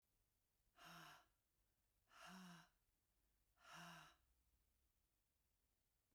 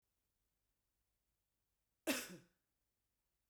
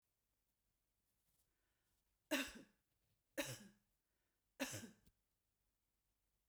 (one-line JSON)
{"exhalation_length": "6.1 s", "exhalation_amplitude": 133, "exhalation_signal_mean_std_ratio": 0.49, "cough_length": "3.5 s", "cough_amplitude": 1875, "cough_signal_mean_std_ratio": 0.2, "three_cough_length": "6.5 s", "three_cough_amplitude": 1500, "three_cough_signal_mean_std_ratio": 0.25, "survey_phase": "beta (2021-08-13 to 2022-03-07)", "age": "45-64", "gender": "Female", "wearing_mask": "No", "symptom_none": true, "smoker_status": "Never smoked", "respiratory_condition_asthma": false, "respiratory_condition_other": false, "recruitment_source": "REACT", "submission_delay": "1 day", "covid_test_result": "Negative", "covid_test_method": "RT-qPCR"}